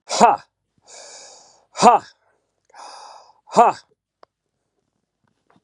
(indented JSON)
{
  "exhalation_length": "5.6 s",
  "exhalation_amplitude": 32768,
  "exhalation_signal_mean_std_ratio": 0.26,
  "survey_phase": "beta (2021-08-13 to 2022-03-07)",
  "age": "45-64",
  "gender": "Male",
  "wearing_mask": "No",
  "symptom_cough_any": true,
  "symptom_runny_or_blocked_nose": true,
  "symptom_change_to_sense_of_smell_or_taste": true,
  "symptom_onset": "5 days",
  "smoker_status": "Current smoker (1 to 10 cigarettes per day)",
  "respiratory_condition_asthma": false,
  "respiratory_condition_other": false,
  "recruitment_source": "Test and Trace",
  "submission_delay": "2 days",
  "covid_test_result": "Positive",
  "covid_test_method": "RT-qPCR"
}